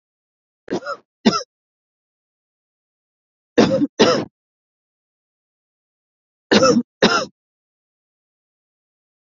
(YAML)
three_cough_length: 9.4 s
three_cough_amplitude: 29009
three_cough_signal_mean_std_ratio: 0.29
survey_phase: beta (2021-08-13 to 2022-03-07)
age: 18-44
gender: Female
wearing_mask: 'No'
symptom_cough_any: true
symptom_sore_throat: true
symptom_fatigue: true
symptom_onset: 12 days
smoker_status: Ex-smoker
respiratory_condition_asthma: true
respiratory_condition_other: false
recruitment_source: REACT
submission_delay: 8 days
covid_test_result: Negative
covid_test_method: RT-qPCR
influenza_a_test_result: Negative
influenza_b_test_result: Negative